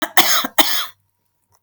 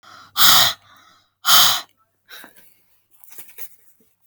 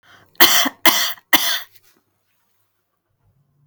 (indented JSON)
{
  "cough_length": "1.6 s",
  "cough_amplitude": 32768,
  "cough_signal_mean_std_ratio": 0.46,
  "exhalation_length": "4.3 s",
  "exhalation_amplitude": 32768,
  "exhalation_signal_mean_std_ratio": 0.34,
  "three_cough_length": "3.7 s",
  "three_cough_amplitude": 32768,
  "three_cough_signal_mean_std_ratio": 0.34,
  "survey_phase": "alpha (2021-03-01 to 2021-08-12)",
  "age": "65+",
  "gender": "Female",
  "wearing_mask": "No",
  "symptom_none": true,
  "smoker_status": "Never smoked",
  "respiratory_condition_asthma": false,
  "respiratory_condition_other": false,
  "recruitment_source": "REACT",
  "submission_delay": "2 days",
  "covid_test_result": "Negative",
  "covid_test_method": "RT-qPCR"
}